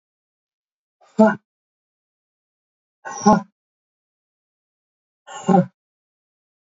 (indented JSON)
{
  "exhalation_length": "6.7 s",
  "exhalation_amplitude": 27013,
  "exhalation_signal_mean_std_ratio": 0.22,
  "survey_phase": "beta (2021-08-13 to 2022-03-07)",
  "age": "45-64",
  "gender": "Male",
  "wearing_mask": "No",
  "symptom_none": true,
  "smoker_status": "Never smoked",
  "respiratory_condition_asthma": false,
  "respiratory_condition_other": false,
  "recruitment_source": "REACT",
  "submission_delay": "3 days",
  "covid_test_result": "Negative",
  "covid_test_method": "RT-qPCR",
  "influenza_a_test_result": "Negative",
  "influenza_b_test_result": "Negative"
}